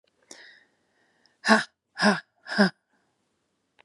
{"exhalation_length": "3.8 s", "exhalation_amplitude": 23722, "exhalation_signal_mean_std_ratio": 0.28, "survey_phase": "beta (2021-08-13 to 2022-03-07)", "age": "45-64", "gender": "Female", "wearing_mask": "No", "symptom_new_continuous_cough": true, "symptom_runny_or_blocked_nose": true, "symptom_shortness_of_breath": true, "symptom_sore_throat": true, "symptom_fatigue": true, "symptom_fever_high_temperature": true, "symptom_headache": true, "symptom_onset": "5 days", "smoker_status": "Ex-smoker", "respiratory_condition_asthma": false, "respiratory_condition_other": false, "recruitment_source": "Test and Trace", "submission_delay": "1 day", "covid_test_result": "Positive", "covid_test_method": "RT-qPCR", "covid_ct_value": 20.9, "covid_ct_gene": "ORF1ab gene"}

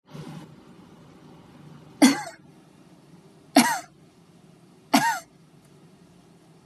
{"three_cough_length": "6.7 s", "three_cough_amplitude": 23082, "three_cough_signal_mean_std_ratio": 0.28, "survey_phase": "beta (2021-08-13 to 2022-03-07)", "age": "18-44", "gender": "Female", "wearing_mask": "No", "symptom_none": true, "smoker_status": "Never smoked", "respiratory_condition_asthma": false, "respiratory_condition_other": false, "recruitment_source": "REACT", "submission_delay": "1 day", "covid_test_result": "Negative", "covid_test_method": "RT-qPCR", "influenza_a_test_result": "Unknown/Void", "influenza_b_test_result": "Unknown/Void"}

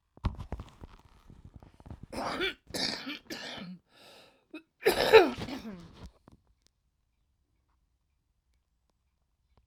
{"cough_length": "9.7 s", "cough_amplitude": 18465, "cough_signal_mean_std_ratio": 0.27, "survey_phase": "alpha (2021-03-01 to 2021-08-12)", "age": "45-64", "gender": "Female", "wearing_mask": "No", "symptom_cough_any": true, "symptom_fatigue": true, "smoker_status": "Current smoker (11 or more cigarettes per day)", "respiratory_condition_asthma": true, "respiratory_condition_other": true, "recruitment_source": "REACT", "submission_delay": "2 days", "covid_test_result": "Negative", "covid_test_method": "RT-qPCR"}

